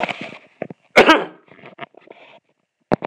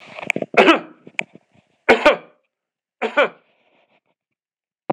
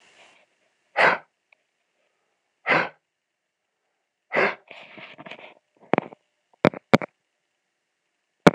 cough_length: 3.1 s
cough_amplitude: 26028
cough_signal_mean_std_ratio: 0.29
three_cough_length: 4.9 s
three_cough_amplitude: 26028
three_cough_signal_mean_std_ratio: 0.3
exhalation_length: 8.5 s
exhalation_amplitude: 26028
exhalation_signal_mean_std_ratio: 0.21
survey_phase: beta (2021-08-13 to 2022-03-07)
age: 45-64
gender: Male
wearing_mask: 'No'
symptom_none: true
smoker_status: Ex-smoker
respiratory_condition_asthma: false
respiratory_condition_other: true
recruitment_source: REACT
submission_delay: 1 day
covid_test_result: Negative
covid_test_method: RT-qPCR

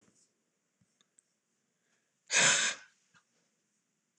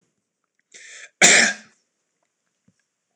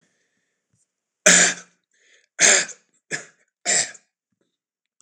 exhalation_length: 4.2 s
exhalation_amplitude: 7343
exhalation_signal_mean_std_ratio: 0.26
cough_length: 3.2 s
cough_amplitude: 26028
cough_signal_mean_std_ratio: 0.26
three_cough_length: 5.0 s
three_cough_amplitude: 26028
three_cough_signal_mean_std_ratio: 0.3
survey_phase: beta (2021-08-13 to 2022-03-07)
age: 45-64
gender: Male
wearing_mask: 'No'
symptom_none: true
symptom_onset: 4 days
smoker_status: Ex-smoker
respiratory_condition_asthma: false
respiratory_condition_other: false
recruitment_source: REACT
submission_delay: 12 days
covid_test_result: Negative
covid_test_method: RT-qPCR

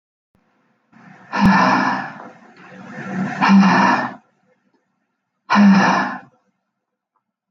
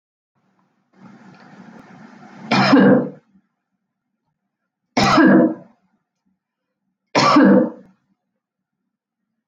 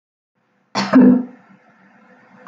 exhalation_length: 7.5 s
exhalation_amplitude: 23677
exhalation_signal_mean_std_ratio: 0.48
three_cough_length: 9.5 s
three_cough_amplitude: 25444
three_cough_signal_mean_std_ratio: 0.36
cough_length: 2.5 s
cough_amplitude: 26306
cough_signal_mean_std_ratio: 0.35
survey_phase: beta (2021-08-13 to 2022-03-07)
age: 45-64
gender: Female
wearing_mask: 'No'
symptom_none: true
smoker_status: Never smoked
respiratory_condition_asthma: false
respiratory_condition_other: false
recruitment_source: REACT
submission_delay: 5 days
covid_test_result: Negative
covid_test_method: RT-qPCR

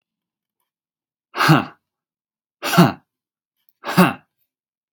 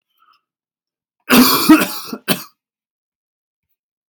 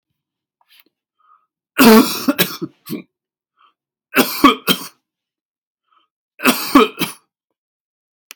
exhalation_length: 4.9 s
exhalation_amplitude: 32768
exhalation_signal_mean_std_ratio: 0.28
cough_length: 4.1 s
cough_amplitude: 32768
cough_signal_mean_std_ratio: 0.32
three_cough_length: 8.4 s
three_cough_amplitude: 32768
three_cough_signal_mean_std_ratio: 0.31
survey_phase: beta (2021-08-13 to 2022-03-07)
age: 18-44
gender: Male
wearing_mask: 'No'
symptom_none: true
smoker_status: Never smoked
respiratory_condition_asthma: false
respiratory_condition_other: false
recruitment_source: REACT
submission_delay: 2 days
covid_test_result: Negative
covid_test_method: RT-qPCR
influenza_a_test_result: Negative
influenza_b_test_result: Negative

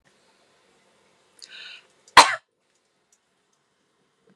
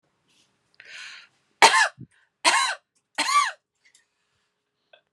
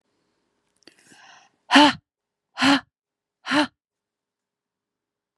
cough_length: 4.4 s
cough_amplitude: 32768
cough_signal_mean_std_ratio: 0.14
three_cough_length: 5.1 s
three_cough_amplitude: 32689
three_cough_signal_mean_std_ratio: 0.31
exhalation_length: 5.4 s
exhalation_amplitude: 27779
exhalation_signal_mean_std_ratio: 0.26
survey_phase: beta (2021-08-13 to 2022-03-07)
age: 18-44
gender: Female
wearing_mask: 'No'
symptom_none: true
smoker_status: Never smoked
respiratory_condition_asthma: false
respiratory_condition_other: false
recruitment_source: REACT
submission_delay: 8 days
covid_test_result: Negative
covid_test_method: RT-qPCR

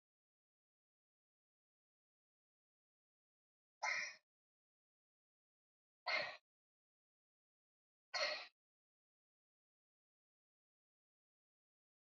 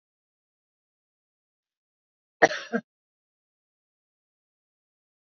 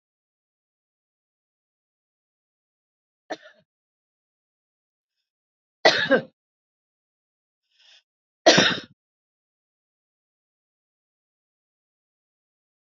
exhalation_length: 12.0 s
exhalation_amplitude: 1396
exhalation_signal_mean_std_ratio: 0.2
cough_length: 5.4 s
cough_amplitude: 28100
cough_signal_mean_std_ratio: 0.12
three_cough_length: 13.0 s
three_cough_amplitude: 32767
three_cough_signal_mean_std_ratio: 0.16
survey_phase: beta (2021-08-13 to 2022-03-07)
age: 65+
gender: Female
wearing_mask: 'No'
symptom_none: true
smoker_status: Ex-smoker
respiratory_condition_asthma: false
respiratory_condition_other: false
recruitment_source: REACT
submission_delay: 3 days
covid_test_result: Negative
covid_test_method: RT-qPCR
influenza_a_test_result: Negative
influenza_b_test_result: Negative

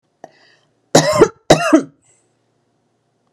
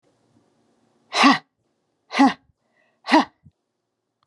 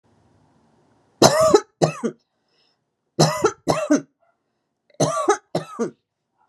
cough_length: 3.3 s
cough_amplitude: 32768
cough_signal_mean_std_ratio: 0.32
exhalation_length: 4.3 s
exhalation_amplitude: 26033
exhalation_signal_mean_std_ratio: 0.28
three_cough_length: 6.5 s
three_cough_amplitude: 32768
three_cough_signal_mean_std_ratio: 0.37
survey_phase: beta (2021-08-13 to 2022-03-07)
age: 45-64
gender: Female
wearing_mask: 'No'
symptom_none: true
smoker_status: Ex-smoker
respiratory_condition_asthma: false
respiratory_condition_other: false
recruitment_source: REACT
submission_delay: 1 day
covid_test_result: Negative
covid_test_method: RT-qPCR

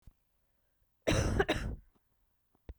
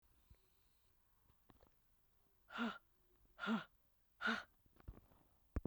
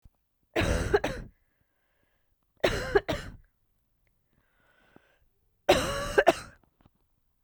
cough_length: 2.8 s
cough_amplitude: 5757
cough_signal_mean_std_ratio: 0.39
exhalation_length: 5.7 s
exhalation_amplitude: 1509
exhalation_signal_mean_std_ratio: 0.32
three_cough_length: 7.4 s
three_cough_amplitude: 17663
three_cough_signal_mean_std_ratio: 0.33
survey_phase: beta (2021-08-13 to 2022-03-07)
age: 45-64
gender: Female
wearing_mask: 'No'
symptom_cough_any: true
symptom_fever_high_temperature: true
symptom_headache: true
symptom_other: true
smoker_status: Never smoked
respiratory_condition_asthma: true
respiratory_condition_other: false
recruitment_source: Test and Trace
submission_delay: 3 days
covid_test_result: Positive
covid_test_method: RT-qPCR
covid_ct_value: 25.1
covid_ct_gene: ORF1ab gene
covid_ct_mean: 25.3
covid_viral_load: 4900 copies/ml
covid_viral_load_category: Minimal viral load (< 10K copies/ml)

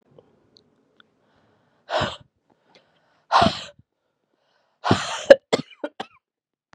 exhalation_length: 6.7 s
exhalation_amplitude: 32768
exhalation_signal_mean_std_ratio: 0.23
survey_phase: beta (2021-08-13 to 2022-03-07)
age: 45-64
gender: Female
wearing_mask: 'No'
symptom_cough_any: true
symptom_runny_or_blocked_nose: true
symptom_sore_throat: true
symptom_fatigue: true
symptom_fever_high_temperature: true
symptom_headache: true
symptom_change_to_sense_of_smell_or_taste: true
symptom_loss_of_taste: true
symptom_onset: 5 days
smoker_status: Never smoked
respiratory_condition_asthma: false
respiratory_condition_other: false
recruitment_source: Test and Trace
submission_delay: 1 day
covid_test_result: Positive
covid_test_method: RT-qPCR
covid_ct_value: 23.3
covid_ct_gene: ORF1ab gene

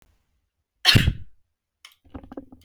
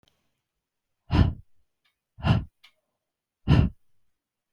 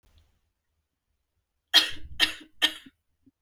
cough_length: 2.6 s
cough_amplitude: 32523
cough_signal_mean_std_ratio: 0.28
exhalation_length: 4.5 s
exhalation_amplitude: 15895
exhalation_signal_mean_std_ratio: 0.29
three_cough_length: 3.4 s
three_cough_amplitude: 23944
three_cough_signal_mean_std_ratio: 0.27
survey_phase: beta (2021-08-13 to 2022-03-07)
age: 18-44
gender: Female
wearing_mask: 'No'
symptom_cough_any: true
symptom_onset: 7 days
smoker_status: Ex-smoker
respiratory_condition_asthma: false
respiratory_condition_other: false
recruitment_source: REACT
submission_delay: 2 days
covid_test_result: Negative
covid_test_method: RT-qPCR
influenza_a_test_result: Negative
influenza_b_test_result: Negative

